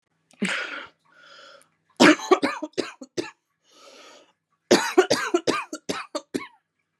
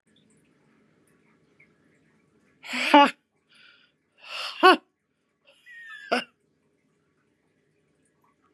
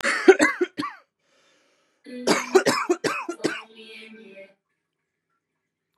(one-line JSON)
{"three_cough_length": "7.0 s", "three_cough_amplitude": 28049, "three_cough_signal_mean_std_ratio": 0.35, "exhalation_length": "8.5 s", "exhalation_amplitude": 31006, "exhalation_signal_mean_std_ratio": 0.2, "cough_length": "6.0 s", "cough_amplitude": 28968, "cough_signal_mean_std_ratio": 0.35, "survey_phase": "beta (2021-08-13 to 2022-03-07)", "age": "18-44", "gender": "Female", "wearing_mask": "No", "symptom_runny_or_blocked_nose": true, "symptom_shortness_of_breath": true, "symptom_fatigue": true, "symptom_headache": true, "symptom_onset": "2 days", "smoker_status": "Ex-smoker", "respiratory_condition_asthma": false, "respiratory_condition_other": false, "recruitment_source": "Test and Trace", "submission_delay": "1 day", "covid_test_result": "Positive", "covid_test_method": "RT-qPCR", "covid_ct_value": 21.2, "covid_ct_gene": "ORF1ab gene", "covid_ct_mean": 21.5, "covid_viral_load": "88000 copies/ml", "covid_viral_load_category": "Low viral load (10K-1M copies/ml)"}